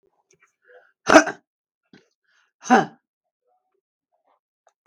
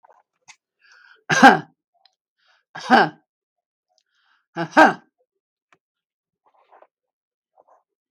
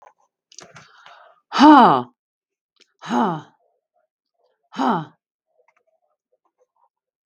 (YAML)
cough_length: 4.9 s
cough_amplitude: 32768
cough_signal_mean_std_ratio: 0.19
three_cough_length: 8.1 s
three_cough_amplitude: 32766
three_cough_signal_mean_std_ratio: 0.22
exhalation_length: 7.3 s
exhalation_amplitude: 32768
exhalation_signal_mean_std_ratio: 0.27
survey_phase: beta (2021-08-13 to 2022-03-07)
age: 65+
gender: Female
wearing_mask: 'No'
symptom_none: true
symptom_onset: 12 days
smoker_status: Current smoker (1 to 10 cigarettes per day)
respiratory_condition_asthma: false
respiratory_condition_other: false
recruitment_source: REACT
submission_delay: 2 days
covid_test_result: Negative
covid_test_method: RT-qPCR
influenza_a_test_result: Negative
influenza_b_test_result: Negative